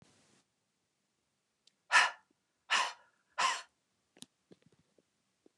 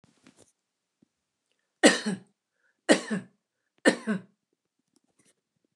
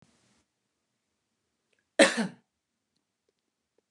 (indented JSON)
{
  "exhalation_length": "5.6 s",
  "exhalation_amplitude": 7708,
  "exhalation_signal_mean_std_ratio": 0.24,
  "three_cough_length": "5.8 s",
  "three_cough_amplitude": 21661,
  "three_cough_signal_mean_std_ratio": 0.23,
  "cough_length": "3.9 s",
  "cough_amplitude": 19698,
  "cough_signal_mean_std_ratio": 0.17,
  "survey_phase": "beta (2021-08-13 to 2022-03-07)",
  "age": "65+",
  "gender": "Female",
  "wearing_mask": "No",
  "symptom_none": true,
  "smoker_status": "Never smoked",
  "respiratory_condition_asthma": false,
  "respiratory_condition_other": false,
  "recruitment_source": "REACT",
  "submission_delay": "2 days",
  "covid_test_result": "Negative",
  "covid_test_method": "RT-qPCR",
  "influenza_a_test_result": "Negative",
  "influenza_b_test_result": "Negative"
}